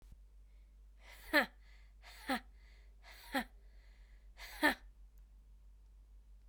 {"exhalation_length": "6.5 s", "exhalation_amplitude": 5154, "exhalation_signal_mean_std_ratio": 0.34, "survey_phase": "alpha (2021-03-01 to 2021-08-12)", "age": "18-44", "gender": "Female", "wearing_mask": "No", "symptom_new_continuous_cough": true, "symptom_shortness_of_breath": true, "symptom_abdominal_pain": true, "symptom_fatigue": true, "symptom_fever_high_temperature": true, "symptom_headache": true, "symptom_change_to_sense_of_smell_or_taste": true, "symptom_loss_of_taste": true, "symptom_onset": "3 days", "smoker_status": "Never smoked", "respiratory_condition_asthma": false, "respiratory_condition_other": false, "recruitment_source": "Test and Trace", "submission_delay": "1 day", "covid_test_result": "Positive", "covid_test_method": "RT-qPCR"}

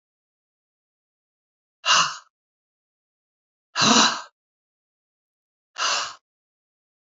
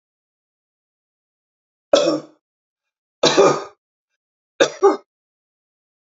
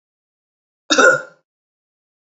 {"exhalation_length": "7.2 s", "exhalation_amplitude": 28749, "exhalation_signal_mean_std_ratio": 0.28, "three_cough_length": "6.1 s", "three_cough_amplitude": 32767, "three_cough_signal_mean_std_ratio": 0.28, "cough_length": "2.4 s", "cough_amplitude": 32768, "cough_signal_mean_std_ratio": 0.27, "survey_phase": "beta (2021-08-13 to 2022-03-07)", "age": "65+", "gender": "Female", "wearing_mask": "No", "symptom_none": true, "smoker_status": "Ex-smoker", "respiratory_condition_asthma": false, "respiratory_condition_other": false, "recruitment_source": "REACT", "submission_delay": "2 days", "covid_test_result": "Negative", "covid_test_method": "RT-qPCR"}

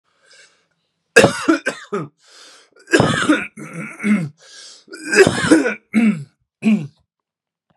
{"three_cough_length": "7.8 s", "three_cough_amplitude": 32768, "three_cough_signal_mean_std_ratio": 0.45, "survey_phase": "beta (2021-08-13 to 2022-03-07)", "age": "45-64", "gender": "Male", "wearing_mask": "No", "symptom_cough_any": true, "symptom_sore_throat": true, "symptom_fatigue": true, "symptom_headache": true, "symptom_onset": "2 days", "smoker_status": "Never smoked", "respiratory_condition_asthma": false, "respiratory_condition_other": false, "recruitment_source": "Test and Trace", "submission_delay": "1 day", "covid_test_result": "Positive", "covid_test_method": "ePCR"}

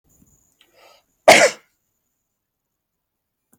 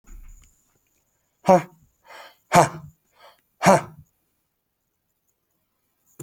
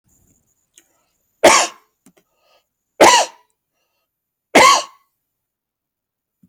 {"cough_length": "3.6 s", "cough_amplitude": 32767, "cough_signal_mean_std_ratio": 0.2, "exhalation_length": "6.2 s", "exhalation_amplitude": 31800, "exhalation_signal_mean_std_ratio": 0.23, "three_cough_length": "6.5 s", "three_cough_amplitude": 32768, "three_cough_signal_mean_std_ratio": 0.28, "survey_phase": "alpha (2021-03-01 to 2021-08-12)", "age": "45-64", "gender": "Male", "wearing_mask": "No", "symptom_none": true, "smoker_status": "Never smoked", "respiratory_condition_asthma": false, "respiratory_condition_other": false, "recruitment_source": "REACT", "submission_delay": "2 days", "covid_test_result": "Negative", "covid_test_method": "RT-qPCR"}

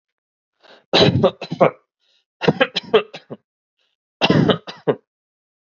{"three_cough_length": "5.7 s", "three_cough_amplitude": 31261, "three_cough_signal_mean_std_ratio": 0.36, "survey_phase": "beta (2021-08-13 to 2022-03-07)", "age": "18-44", "gender": "Male", "wearing_mask": "No", "symptom_cough_any": true, "symptom_new_continuous_cough": true, "symptom_runny_or_blocked_nose": true, "symptom_sore_throat": true, "symptom_onset": "11 days", "smoker_status": "Ex-smoker", "respiratory_condition_asthma": false, "respiratory_condition_other": false, "recruitment_source": "REACT", "submission_delay": "1 day", "covid_test_result": "Negative", "covid_test_method": "RT-qPCR"}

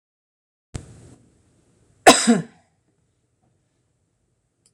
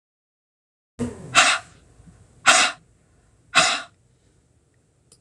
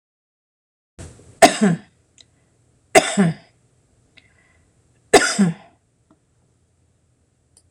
{"cough_length": "4.7 s", "cough_amplitude": 26028, "cough_signal_mean_std_ratio": 0.19, "exhalation_length": "5.2 s", "exhalation_amplitude": 26028, "exhalation_signal_mean_std_ratio": 0.32, "three_cough_length": "7.7 s", "three_cough_amplitude": 26028, "three_cough_signal_mean_std_ratio": 0.27, "survey_phase": "beta (2021-08-13 to 2022-03-07)", "age": "65+", "gender": "Female", "wearing_mask": "No", "symptom_none": true, "smoker_status": "Ex-smoker", "respiratory_condition_asthma": false, "respiratory_condition_other": false, "recruitment_source": "REACT", "submission_delay": "3 days", "covid_test_result": "Negative", "covid_test_method": "RT-qPCR"}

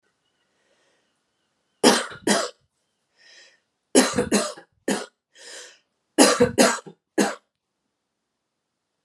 {"three_cough_length": "9.0 s", "three_cough_amplitude": 32767, "three_cough_signal_mean_std_ratio": 0.32, "survey_phase": "beta (2021-08-13 to 2022-03-07)", "age": "18-44", "gender": "Female", "wearing_mask": "No", "symptom_cough_any": true, "symptom_runny_or_blocked_nose": true, "symptom_shortness_of_breath": true, "symptom_sore_throat": true, "symptom_abdominal_pain": true, "symptom_fatigue": true, "symptom_fever_high_temperature": true, "symptom_headache": true, "symptom_onset": "3 days", "smoker_status": "Ex-smoker", "respiratory_condition_asthma": false, "respiratory_condition_other": false, "recruitment_source": "Test and Trace", "submission_delay": "2 days", "covid_test_result": "Positive", "covid_test_method": "RT-qPCR", "covid_ct_value": 26.4, "covid_ct_gene": "ORF1ab gene"}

